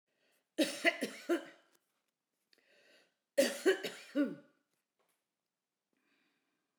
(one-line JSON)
{"cough_length": "6.8 s", "cough_amplitude": 6379, "cough_signal_mean_std_ratio": 0.3, "survey_phase": "beta (2021-08-13 to 2022-03-07)", "age": "65+", "gender": "Female", "wearing_mask": "No", "symptom_none": true, "smoker_status": "Never smoked", "respiratory_condition_asthma": false, "respiratory_condition_other": false, "recruitment_source": "REACT", "submission_delay": "3 days", "covid_test_result": "Negative", "covid_test_method": "RT-qPCR"}